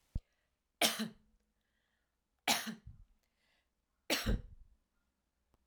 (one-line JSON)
{"three_cough_length": "5.7 s", "three_cough_amplitude": 7090, "three_cough_signal_mean_std_ratio": 0.3, "survey_phase": "alpha (2021-03-01 to 2021-08-12)", "age": "65+", "gender": "Female", "wearing_mask": "No", "symptom_headache": true, "symptom_change_to_sense_of_smell_or_taste": true, "symptom_loss_of_taste": true, "symptom_onset": "5 days", "smoker_status": "Never smoked", "respiratory_condition_asthma": false, "respiratory_condition_other": false, "recruitment_source": "Test and Trace", "submission_delay": "2 days", "covid_test_result": "Positive", "covid_test_method": "RT-qPCR"}